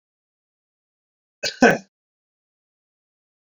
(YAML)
cough_length: 3.5 s
cough_amplitude: 28451
cough_signal_mean_std_ratio: 0.18
survey_phase: beta (2021-08-13 to 2022-03-07)
age: 65+
gender: Male
wearing_mask: 'No'
symptom_none: true
smoker_status: Never smoked
respiratory_condition_asthma: false
respiratory_condition_other: false
recruitment_source: REACT
submission_delay: 1 day
covid_test_result: Negative
covid_test_method: RT-qPCR
influenza_a_test_result: Negative
influenza_b_test_result: Negative